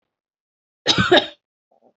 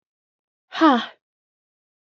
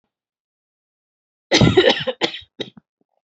cough_length: 2.0 s
cough_amplitude: 28056
cough_signal_mean_std_ratio: 0.32
exhalation_length: 2.0 s
exhalation_amplitude: 20082
exhalation_signal_mean_std_ratio: 0.27
three_cough_length: 3.3 s
three_cough_amplitude: 31320
three_cough_signal_mean_std_ratio: 0.33
survey_phase: beta (2021-08-13 to 2022-03-07)
age: 18-44
gender: Female
wearing_mask: 'No'
symptom_cough_any: true
symptom_new_continuous_cough: true
symptom_runny_or_blocked_nose: true
symptom_sore_throat: true
symptom_fatigue: true
symptom_onset: 10 days
smoker_status: Never smoked
respiratory_condition_asthma: false
respiratory_condition_other: false
recruitment_source: Test and Trace
submission_delay: 2 days
covid_test_result: Negative
covid_test_method: RT-qPCR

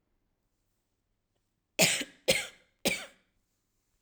three_cough_length: 4.0 s
three_cough_amplitude: 12740
three_cough_signal_mean_std_ratio: 0.27
survey_phase: alpha (2021-03-01 to 2021-08-12)
age: 18-44
gender: Female
wearing_mask: 'No'
symptom_none: true
smoker_status: Never smoked
respiratory_condition_asthma: false
respiratory_condition_other: false
recruitment_source: REACT
submission_delay: 1 day
covid_test_result: Negative
covid_test_method: RT-qPCR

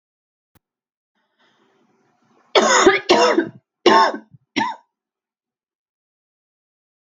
cough_length: 7.2 s
cough_amplitude: 32767
cough_signal_mean_std_ratio: 0.33
survey_phase: beta (2021-08-13 to 2022-03-07)
age: 45-64
gender: Female
wearing_mask: 'No'
symptom_cough_any: true
symptom_runny_or_blocked_nose: true
symptom_fatigue: true
symptom_change_to_sense_of_smell_or_taste: true
symptom_loss_of_taste: true
symptom_onset: 5 days
smoker_status: Never smoked
respiratory_condition_asthma: false
respiratory_condition_other: false
recruitment_source: Test and Trace
submission_delay: 2 days
covid_test_result: Positive
covid_test_method: RT-qPCR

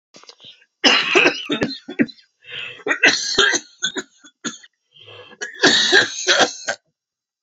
three_cough_length: 7.4 s
three_cough_amplitude: 32768
three_cough_signal_mean_std_ratio: 0.48
survey_phase: alpha (2021-03-01 to 2021-08-12)
age: 45-64
gender: Female
wearing_mask: 'No'
symptom_cough_any: true
symptom_shortness_of_breath: true
symptom_fatigue: true
symptom_headache: true
smoker_status: Never smoked
respiratory_condition_asthma: true
respiratory_condition_other: false
recruitment_source: Test and Trace
submission_delay: 2 days
covid_test_result: Positive
covid_test_method: RT-qPCR
covid_ct_value: 12.3
covid_ct_gene: ORF1ab gene
covid_ct_mean: 12.8
covid_viral_load: 62000000 copies/ml
covid_viral_load_category: High viral load (>1M copies/ml)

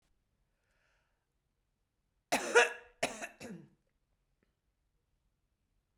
cough_length: 6.0 s
cough_amplitude: 9384
cough_signal_mean_std_ratio: 0.21
survey_phase: beta (2021-08-13 to 2022-03-07)
age: 45-64
gender: Female
wearing_mask: 'No'
symptom_cough_any: true
symptom_runny_or_blocked_nose: true
symptom_shortness_of_breath: true
symptom_sore_throat: true
symptom_fatigue: true
symptom_fever_high_temperature: true
symptom_headache: true
symptom_change_to_sense_of_smell_or_taste: true
symptom_other: true
symptom_onset: 6 days
smoker_status: Never smoked
respiratory_condition_asthma: false
respiratory_condition_other: false
recruitment_source: Test and Trace
submission_delay: 2 days
covid_test_result: Positive
covid_test_method: ePCR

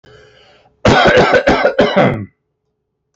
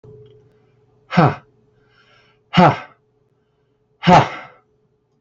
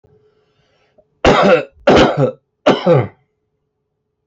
cough_length: 3.2 s
cough_amplitude: 29691
cough_signal_mean_std_ratio: 0.57
exhalation_length: 5.2 s
exhalation_amplitude: 30177
exhalation_signal_mean_std_ratio: 0.29
three_cough_length: 4.3 s
three_cough_amplitude: 32767
three_cough_signal_mean_std_ratio: 0.44
survey_phase: alpha (2021-03-01 to 2021-08-12)
age: 45-64
gender: Male
wearing_mask: 'No'
symptom_none: true
smoker_status: Never smoked
respiratory_condition_asthma: false
respiratory_condition_other: false
recruitment_source: REACT
submission_delay: 2 days
covid_test_result: Negative
covid_test_method: RT-qPCR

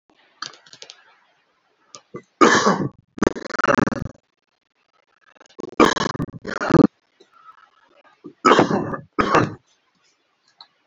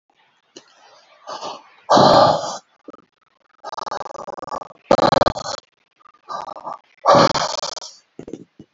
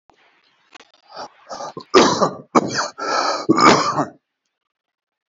three_cough_length: 10.9 s
three_cough_amplitude: 28557
three_cough_signal_mean_std_ratio: 0.33
exhalation_length: 8.7 s
exhalation_amplitude: 32037
exhalation_signal_mean_std_ratio: 0.36
cough_length: 5.3 s
cough_amplitude: 30286
cough_signal_mean_std_ratio: 0.43
survey_phase: beta (2021-08-13 to 2022-03-07)
age: 65+
gender: Male
wearing_mask: 'No'
symptom_none: true
smoker_status: Never smoked
respiratory_condition_asthma: false
respiratory_condition_other: false
recruitment_source: REACT
submission_delay: 2 days
covid_test_result: Negative
covid_test_method: RT-qPCR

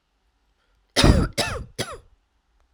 three_cough_length: 2.7 s
three_cough_amplitude: 31436
three_cough_signal_mean_std_ratio: 0.33
survey_phase: alpha (2021-03-01 to 2021-08-12)
age: 18-44
gender: Female
wearing_mask: 'No'
symptom_cough_any: true
symptom_diarrhoea: true
symptom_headache: true
symptom_change_to_sense_of_smell_or_taste: true
smoker_status: Never smoked
respiratory_condition_asthma: false
respiratory_condition_other: false
recruitment_source: Test and Trace
submission_delay: 2 days
covid_test_result: Positive
covid_test_method: RT-qPCR
covid_ct_value: 19.4
covid_ct_gene: ORF1ab gene
covid_ct_mean: 20.4
covid_viral_load: 200000 copies/ml
covid_viral_load_category: Low viral load (10K-1M copies/ml)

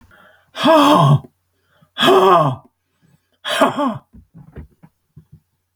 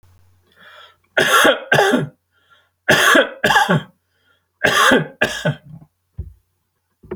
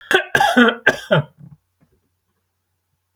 exhalation_length: 5.8 s
exhalation_amplitude: 32768
exhalation_signal_mean_std_ratio: 0.45
three_cough_length: 7.2 s
three_cough_amplitude: 30172
three_cough_signal_mean_std_ratio: 0.47
cough_length: 3.2 s
cough_amplitude: 32767
cough_signal_mean_std_ratio: 0.39
survey_phase: beta (2021-08-13 to 2022-03-07)
age: 65+
gender: Male
wearing_mask: 'No'
symptom_none: true
smoker_status: Ex-smoker
respiratory_condition_asthma: false
respiratory_condition_other: false
recruitment_source: REACT
submission_delay: 1 day
covid_test_result: Negative
covid_test_method: RT-qPCR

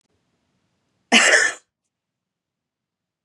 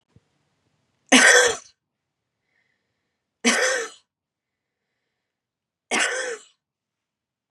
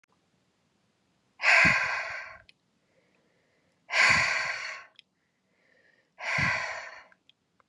cough_length: 3.2 s
cough_amplitude: 29626
cough_signal_mean_std_ratio: 0.28
three_cough_length: 7.5 s
three_cough_amplitude: 31928
three_cough_signal_mean_std_ratio: 0.29
exhalation_length: 7.7 s
exhalation_amplitude: 11990
exhalation_signal_mean_std_ratio: 0.4
survey_phase: beta (2021-08-13 to 2022-03-07)
age: 45-64
gender: Female
wearing_mask: 'No'
symptom_none: true
smoker_status: Never smoked
respiratory_condition_asthma: false
respiratory_condition_other: false
recruitment_source: REACT
submission_delay: 2 days
covid_test_result: Negative
covid_test_method: RT-qPCR
influenza_a_test_result: Negative
influenza_b_test_result: Negative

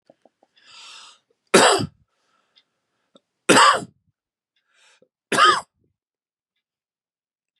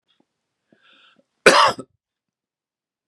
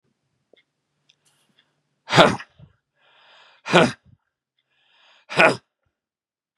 three_cough_length: 7.6 s
three_cough_amplitude: 32767
three_cough_signal_mean_std_ratio: 0.27
cough_length: 3.1 s
cough_amplitude: 32768
cough_signal_mean_std_ratio: 0.23
exhalation_length: 6.6 s
exhalation_amplitude: 32767
exhalation_signal_mean_std_ratio: 0.23
survey_phase: beta (2021-08-13 to 2022-03-07)
age: 65+
gender: Male
wearing_mask: 'No'
symptom_cough_any: true
symptom_runny_or_blocked_nose: true
symptom_sore_throat: true
smoker_status: Never smoked
respiratory_condition_asthma: false
respiratory_condition_other: false
recruitment_source: Test and Trace
submission_delay: 1 day
covid_test_result: Negative
covid_test_method: ePCR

